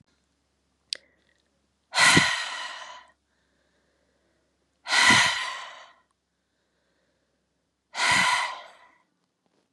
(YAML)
exhalation_length: 9.7 s
exhalation_amplitude: 19431
exhalation_signal_mean_std_ratio: 0.34
survey_phase: beta (2021-08-13 to 2022-03-07)
age: 18-44
gender: Female
wearing_mask: 'No'
symptom_cough_any: true
symptom_runny_or_blocked_nose: true
symptom_fatigue: true
symptom_headache: true
symptom_onset: 3 days
smoker_status: Never smoked
respiratory_condition_asthma: false
respiratory_condition_other: false
recruitment_source: Test and Trace
submission_delay: 2 days
covid_test_result: Positive
covid_test_method: ePCR